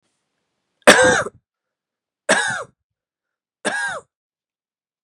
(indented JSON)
{
  "three_cough_length": "5.0 s",
  "three_cough_amplitude": 32768,
  "three_cough_signal_mean_std_ratio": 0.3,
  "survey_phase": "beta (2021-08-13 to 2022-03-07)",
  "age": "18-44",
  "gender": "Male",
  "wearing_mask": "No",
  "symptom_cough_any": true,
  "symptom_runny_or_blocked_nose": true,
  "symptom_shortness_of_breath": true,
  "symptom_sore_throat": true,
  "symptom_fatigue": true,
  "symptom_headache": true,
  "symptom_change_to_sense_of_smell_or_taste": true,
  "symptom_loss_of_taste": true,
  "symptom_onset": "5 days",
  "smoker_status": "Never smoked",
  "respiratory_condition_asthma": false,
  "respiratory_condition_other": false,
  "recruitment_source": "Test and Trace",
  "submission_delay": "1 day",
  "covid_test_result": "Positive",
  "covid_test_method": "RT-qPCR",
  "covid_ct_value": 16.3,
  "covid_ct_gene": "ORF1ab gene",
  "covid_ct_mean": 16.8,
  "covid_viral_load": "3100000 copies/ml",
  "covid_viral_load_category": "High viral load (>1M copies/ml)"
}